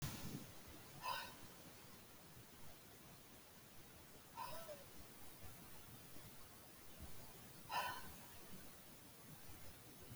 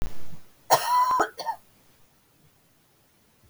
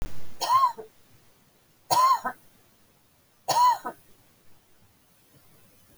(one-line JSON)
{"exhalation_length": "10.2 s", "exhalation_amplitude": 1218, "exhalation_signal_mean_std_ratio": 0.88, "cough_length": "3.5 s", "cough_amplitude": 21582, "cough_signal_mean_std_ratio": 0.5, "three_cough_length": "6.0 s", "three_cough_amplitude": 12913, "three_cough_signal_mean_std_ratio": 0.43, "survey_phase": "alpha (2021-03-01 to 2021-08-12)", "age": "65+", "gender": "Female", "wearing_mask": "No", "symptom_none": true, "smoker_status": "Never smoked", "respiratory_condition_asthma": false, "respiratory_condition_other": false, "recruitment_source": "REACT", "submission_delay": "2 days", "covid_test_result": "Negative", "covid_test_method": "RT-qPCR"}